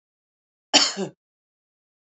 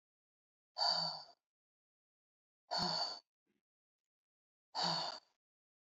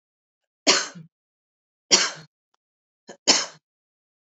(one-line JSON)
{"cough_length": "2.0 s", "cough_amplitude": 30867, "cough_signal_mean_std_ratio": 0.25, "exhalation_length": "5.8 s", "exhalation_amplitude": 2452, "exhalation_signal_mean_std_ratio": 0.38, "three_cough_length": "4.4 s", "three_cough_amplitude": 32768, "three_cough_signal_mean_std_ratio": 0.26, "survey_phase": "beta (2021-08-13 to 2022-03-07)", "age": "45-64", "gender": "Female", "wearing_mask": "No", "symptom_none": true, "smoker_status": "Never smoked", "respiratory_condition_asthma": false, "respiratory_condition_other": false, "recruitment_source": "REACT", "submission_delay": "3 days", "covid_test_result": "Negative", "covid_test_method": "RT-qPCR"}